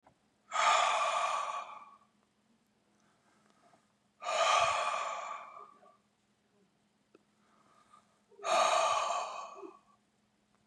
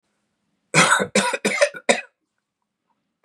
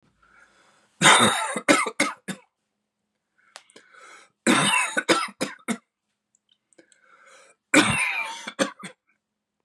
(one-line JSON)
{"exhalation_length": "10.7 s", "exhalation_amplitude": 5599, "exhalation_signal_mean_std_ratio": 0.46, "cough_length": "3.2 s", "cough_amplitude": 29159, "cough_signal_mean_std_ratio": 0.4, "three_cough_length": "9.6 s", "three_cough_amplitude": 27485, "three_cough_signal_mean_std_ratio": 0.38, "survey_phase": "beta (2021-08-13 to 2022-03-07)", "age": "45-64", "gender": "Male", "wearing_mask": "No", "symptom_cough_any": true, "symptom_sore_throat": true, "smoker_status": "Never smoked", "respiratory_condition_asthma": false, "respiratory_condition_other": false, "recruitment_source": "Test and Trace", "submission_delay": "2 days", "covid_test_result": "Positive", "covid_test_method": "RT-qPCR", "covid_ct_value": 17.7, "covid_ct_gene": "N gene", "covid_ct_mean": 17.8, "covid_viral_load": "1400000 copies/ml", "covid_viral_load_category": "High viral load (>1M copies/ml)"}